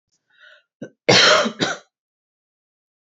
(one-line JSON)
{"cough_length": "3.2 s", "cough_amplitude": 30562, "cough_signal_mean_std_ratio": 0.33, "survey_phase": "beta (2021-08-13 to 2022-03-07)", "age": "18-44", "gender": "Female", "wearing_mask": "No", "symptom_sore_throat": true, "symptom_fatigue": true, "symptom_headache": true, "symptom_change_to_sense_of_smell_or_taste": true, "symptom_loss_of_taste": true, "symptom_other": true, "smoker_status": "Never smoked", "respiratory_condition_asthma": true, "respiratory_condition_other": false, "recruitment_source": "Test and Trace", "submission_delay": "2 days", "covid_test_result": "Positive", "covid_test_method": "LFT"}